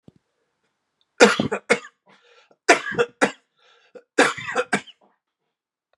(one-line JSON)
{"three_cough_length": "6.0 s", "three_cough_amplitude": 32768, "three_cough_signal_mean_std_ratio": 0.3, "survey_phase": "beta (2021-08-13 to 2022-03-07)", "age": "45-64", "gender": "Male", "wearing_mask": "No", "symptom_cough_any": true, "symptom_runny_or_blocked_nose": true, "symptom_fatigue": true, "symptom_headache": true, "smoker_status": "Never smoked", "respiratory_condition_asthma": false, "respiratory_condition_other": false, "recruitment_source": "Test and Trace", "submission_delay": "2 days", "covid_test_result": "Positive", "covid_test_method": "RT-qPCR", "covid_ct_value": 22.6, "covid_ct_gene": "ORF1ab gene", "covid_ct_mean": 23.0, "covid_viral_load": "28000 copies/ml", "covid_viral_load_category": "Low viral load (10K-1M copies/ml)"}